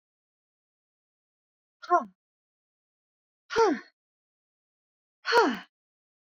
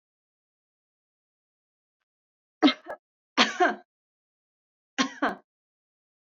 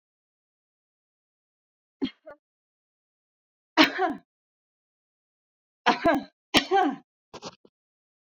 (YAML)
exhalation_length: 6.3 s
exhalation_amplitude: 11279
exhalation_signal_mean_std_ratio: 0.25
cough_length: 6.2 s
cough_amplitude: 15987
cough_signal_mean_std_ratio: 0.23
three_cough_length: 8.3 s
three_cough_amplitude: 24905
three_cough_signal_mean_std_ratio: 0.26
survey_phase: beta (2021-08-13 to 2022-03-07)
age: 45-64
gender: Female
wearing_mask: 'No'
symptom_none: true
smoker_status: Current smoker (e-cigarettes or vapes only)
respiratory_condition_asthma: false
respiratory_condition_other: false
recruitment_source: Test and Trace
submission_delay: 1 day
covid_test_result: Negative
covid_test_method: RT-qPCR